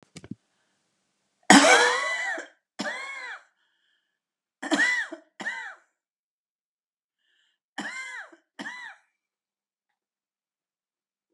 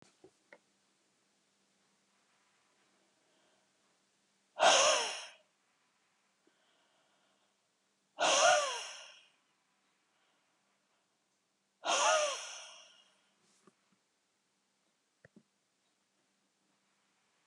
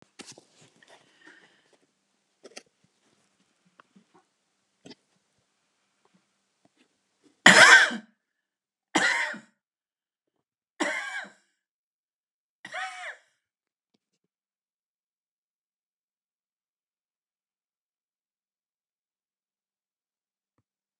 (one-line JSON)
{"cough_length": "11.3 s", "cough_amplitude": 32280, "cough_signal_mean_std_ratio": 0.28, "exhalation_length": "17.5 s", "exhalation_amplitude": 7833, "exhalation_signal_mean_std_ratio": 0.26, "three_cough_length": "21.0 s", "three_cough_amplitude": 32768, "three_cough_signal_mean_std_ratio": 0.16, "survey_phase": "alpha (2021-03-01 to 2021-08-12)", "age": "65+", "gender": "Female", "wearing_mask": "No", "symptom_none": true, "smoker_status": "Ex-smoker", "respiratory_condition_asthma": false, "respiratory_condition_other": false, "recruitment_source": "REACT", "submission_delay": "2 days", "covid_test_result": "Negative", "covid_test_method": "RT-qPCR"}